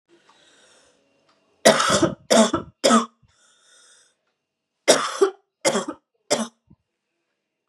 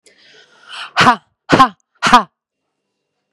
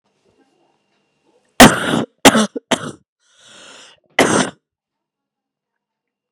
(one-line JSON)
{"three_cough_length": "7.7 s", "three_cough_amplitude": 32728, "three_cough_signal_mean_std_ratio": 0.34, "exhalation_length": "3.3 s", "exhalation_amplitude": 32768, "exhalation_signal_mean_std_ratio": 0.33, "cough_length": "6.3 s", "cough_amplitude": 32768, "cough_signal_mean_std_ratio": 0.27, "survey_phase": "beta (2021-08-13 to 2022-03-07)", "age": "18-44", "gender": "Female", "wearing_mask": "No", "symptom_cough_any": true, "symptom_runny_or_blocked_nose": true, "symptom_diarrhoea": true, "symptom_fatigue": true, "symptom_headache": true, "symptom_other": true, "symptom_onset": "5 days", "smoker_status": "Prefer not to say", "respiratory_condition_asthma": false, "respiratory_condition_other": false, "recruitment_source": "Test and Trace", "submission_delay": "1 day", "covid_test_result": "Positive", "covid_test_method": "RT-qPCR", "covid_ct_value": 17.9, "covid_ct_gene": "ORF1ab gene"}